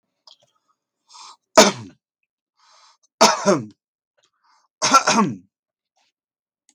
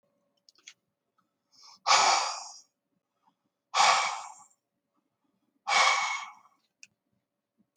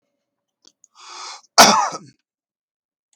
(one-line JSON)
{"three_cough_length": "6.7 s", "three_cough_amplitude": 32766, "three_cough_signal_mean_std_ratio": 0.28, "exhalation_length": "7.8 s", "exhalation_amplitude": 13657, "exhalation_signal_mean_std_ratio": 0.35, "cough_length": "3.2 s", "cough_amplitude": 32768, "cough_signal_mean_std_ratio": 0.26, "survey_phase": "beta (2021-08-13 to 2022-03-07)", "age": "65+", "gender": "Male", "wearing_mask": "No", "symptom_cough_any": true, "smoker_status": "Ex-smoker", "respiratory_condition_asthma": false, "respiratory_condition_other": false, "recruitment_source": "REACT", "submission_delay": "1 day", "covid_test_result": "Negative", "covid_test_method": "RT-qPCR", "influenza_a_test_result": "Negative", "influenza_b_test_result": "Negative"}